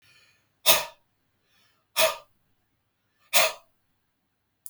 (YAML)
exhalation_length: 4.7 s
exhalation_amplitude: 23364
exhalation_signal_mean_std_ratio: 0.25
survey_phase: beta (2021-08-13 to 2022-03-07)
age: 45-64
gender: Female
wearing_mask: 'No'
symptom_none: true
smoker_status: Never smoked
respiratory_condition_asthma: false
respiratory_condition_other: false
recruitment_source: Test and Trace
submission_delay: -4 days
covid_test_result: Negative
covid_test_method: LFT